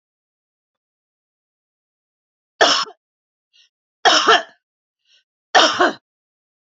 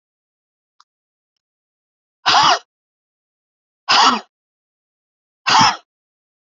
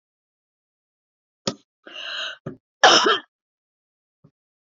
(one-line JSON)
{"three_cough_length": "6.7 s", "three_cough_amplitude": 31915, "three_cough_signal_mean_std_ratio": 0.29, "exhalation_length": "6.5 s", "exhalation_amplitude": 31006, "exhalation_signal_mean_std_ratio": 0.3, "cough_length": "4.6 s", "cough_amplitude": 27272, "cough_signal_mean_std_ratio": 0.26, "survey_phase": "beta (2021-08-13 to 2022-03-07)", "age": "45-64", "gender": "Female", "wearing_mask": "No", "symptom_sore_throat": true, "smoker_status": "Never smoked", "respiratory_condition_asthma": false, "respiratory_condition_other": false, "recruitment_source": "REACT", "submission_delay": "6 days", "covid_test_result": "Negative", "covid_test_method": "RT-qPCR", "influenza_a_test_result": "Negative", "influenza_b_test_result": "Negative"}